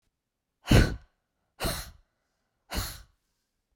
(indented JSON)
{
  "exhalation_length": "3.8 s",
  "exhalation_amplitude": 14552,
  "exhalation_signal_mean_std_ratio": 0.27,
  "survey_phase": "beta (2021-08-13 to 2022-03-07)",
  "age": "45-64",
  "gender": "Female",
  "wearing_mask": "No",
  "symptom_none": true,
  "smoker_status": "Never smoked",
  "respiratory_condition_asthma": false,
  "respiratory_condition_other": false,
  "recruitment_source": "REACT",
  "submission_delay": "3 days",
  "covid_test_result": "Negative",
  "covid_test_method": "RT-qPCR",
  "influenza_a_test_result": "Unknown/Void",
  "influenza_b_test_result": "Unknown/Void"
}